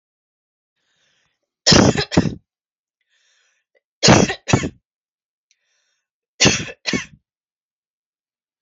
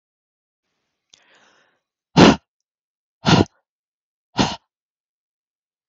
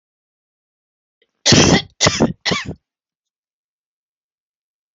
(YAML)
three_cough_length: 8.6 s
three_cough_amplitude: 32768
three_cough_signal_mean_std_ratio: 0.28
exhalation_length: 5.9 s
exhalation_amplitude: 30981
exhalation_signal_mean_std_ratio: 0.21
cough_length: 4.9 s
cough_amplitude: 32767
cough_signal_mean_std_ratio: 0.31
survey_phase: alpha (2021-03-01 to 2021-08-12)
age: 45-64
gender: Female
wearing_mask: 'No'
symptom_none: true
smoker_status: Never smoked
respiratory_condition_asthma: true
respiratory_condition_other: false
recruitment_source: REACT
submission_delay: 2 days
covid_test_result: Negative
covid_test_method: RT-qPCR